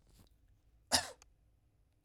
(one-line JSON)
{"cough_length": "2.0 s", "cough_amplitude": 6249, "cough_signal_mean_std_ratio": 0.22, "survey_phase": "alpha (2021-03-01 to 2021-08-12)", "age": "45-64", "gender": "Male", "wearing_mask": "No", "symptom_none": true, "smoker_status": "Never smoked", "respiratory_condition_asthma": false, "respiratory_condition_other": false, "recruitment_source": "REACT", "submission_delay": "3 days", "covid_test_result": "Negative", "covid_test_method": "RT-qPCR"}